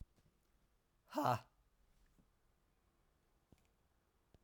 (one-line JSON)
{"exhalation_length": "4.4 s", "exhalation_amplitude": 2193, "exhalation_signal_mean_std_ratio": 0.22, "survey_phase": "alpha (2021-03-01 to 2021-08-12)", "age": "45-64", "gender": "Male", "wearing_mask": "No", "symptom_cough_any": true, "smoker_status": "Never smoked", "respiratory_condition_asthma": false, "respiratory_condition_other": false, "recruitment_source": "Test and Trace", "submission_delay": "2 days", "covid_test_result": "Positive", "covid_test_method": "RT-qPCR", "covid_ct_value": 29.4, "covid_ct_gene": "ORF1ab gene", "covid_ct_mean": 29.9, "covid_viral_load": "160 copies/ml", "covid_viral_load_category": "Minimal viral load (< 10K copies/ml)"}